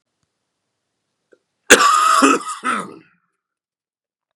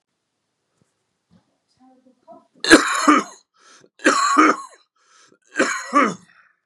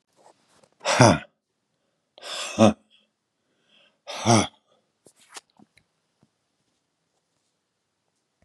{
  "cough_length": "4.4 s",
  "cough_amplitude": 32768,
  "cough_signal_mean_std_ratio": 0.36,
  "three_cough_length": "6.7 s",
  "three_cough_amplitude": 32768,
  "three_cough_signal_mean_std_ratio": 0.35,
  "exhalation_length": "8.4 s",
  "exhalation_amplitude": 29093,
  "exhalation_signal_mean_std_ratio": 0.23,
  "survey_phase": "beta (2021-08-13 to 2022-03-07)",
  "age": "45-64",
  "gender": "Male",
  "wearing_mask": "No",
  "symptom_cough_any": true,
  "symptom_new_continuous_cough": true,
  "symptom_fatigue": true,
  "symptom_onset": "12 days",
  "smoker_status": "Never smoked",
  "respiratory_condition_asthma": false,
  "respiratory_condition_other": false,
  "recruitment_source": "REACT",
  "submission_delay": "6 days",
  "covid_test_result": "Negative",
  "covid_test_method": "RT-qPCR",
  "influenza_a_test_result": "Unknown/Void",
  "influenza_b_test_result": "Unknown/Void"
}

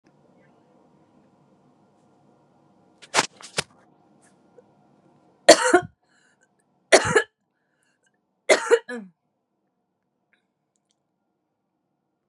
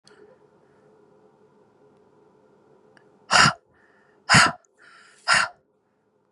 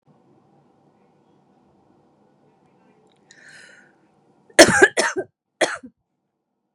{
  "three_cough_length": "12.3 s",
  "three_cough_amplitude": 32768,
  "three_cough_signal_mean_std_ratio": 0.2,
  "exhalation_length": "6.3 s",
  "exhalation_amplitude": 30813,
  "exhalation_signal_mean_std_ratio": 0.26,
  "cough_length": "6.7 s",
  "cough_amplitude": 32768,
  "cough_signal_mean_std_ratio": 0.2,
  "survey_phase": "beta (2021-08-13 to 2022-03-07)",
  "age": "45-64",
  "gender": "Female",
  "wearing_mask": "No",
  "symptom_cough_any": true,
  "smoker_status": "Current smoker (11 or more cigarettes per day)",
  "respiratory_condition_asthma": true,
  "respiratory_condition_other": false,
  "recruitment_source": "Test and Trace",
  "submission_delay": "2 days",
  "covid_test_result": "Positive",
  "covid_test_method": "LAMP"
}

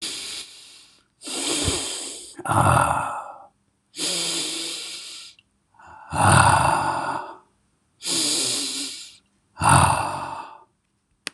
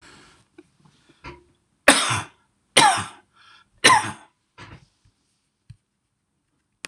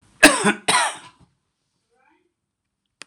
{
  "exhalation_length": "11.3 s",
  "exhalation_amplitude": 24833,
  "exhalation_signal_mean_std_ratio": 0.55,
  "three_cough_length": "6.9 s",
  "three_cough_amplitude": 26028,
  "three_cough_signal_mean_std_ratio": 0.27,
  "cough_length": "3.1 s",
  "cough_amplitude": 26028,
  "cough_signal_mean_std_ratio": 0.29,
  "survey_phase": "beta (2021-08-13 to 2022-03-07)",
  "age": "65+",
  "gender": "Male",
  "wearing_mask": "No",
  "symptom_none": true,
  "smoker_status": "Never smoked",
  "respiratory_condition_asthma": false,
  "respiratory_condition_other": false,
  "recruitment_source": "REACT",
  "submission_delay": "1 day",
  "covid_test_result": "Negative",
  "covid_test_method": "RT-qPCR",
  "influenza_a_test_result": "Negative",
  "influenza_b_test_result": "Negative"
}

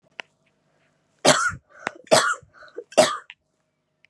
{
  "three_cough_length": "4.1 s",
  "three_cough_amplitude": 32047,
  "three_cough_signal_mean_std_ratio": 0.32,
  "survey_phase": "beta (2021-08-13 to 2022-03-07)",
  "age": "18-44",
  "gender": "Female",
  "wearing_mask": "No",
  "symptom_runny_or_blocked_nose": true,
  "symptom_sore_throat": true,
  "symptom_abdominal_pain": true,
  "symptom_fatigue": true,
  "symptom_fever_high_temperature": true,
  "symptom_headache": true,
  "symptom_change_to_sense_of_smell_or_taste": true,
  "symptom_loss_of_taste": true,
  "symptom_onset": "3 days",
  "smoker_status": "Never smoked",
  "respiratory_condition_asthma": false,
  "respiratory_condition_other": false,
  "recruitment_source": "Test and Trace",
  "submission_delay": "1 day",
  "covid_test_result": "Positive",
  "covid_test_method": "RT-qPCR",
  "covid_ct_value": 24.8,
  "covid_ct_gene": "ORF1ab gene"
}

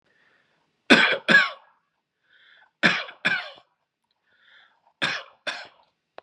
{
  "cough_length": "6.2 s",
  "cough_amplitude": 32767,
  "cough_signal_mean_std_ratio": 0.3,
  "survey_phase": "beta (2021-08-13 to 2022-03-07)",
  "age": "18-44",
  "gender": "Male",
  "wearing_mask": "No",
  "symptom_cough_any": true,
  "symptom_runny_or_blocked_nose": true,
  "symptom_change_to_sense_of_smell_or_taste": true,
  "symptom_onset": "5 days",
  "smoker_status": "Never smoked",
  "respiratory_condition_asthma": false,
  "respiratory_condition_other": false,
  "recruitment_source": "Test and Trace",
  "submission_delay": "2 days",
  "covid_test_result": "Positive",
  "covid_test_method": "RT-qPCR",
  "covid_ct_value": 23.6,
  "covid_ct_gene": "ORF1ab gene",
  "covid_ct_mean": 23.9,
  "covid_viral_load": "14000 copies/ml",
  "covid_viral_load_category": "Low viral load (10K-1M copies/ml)"
}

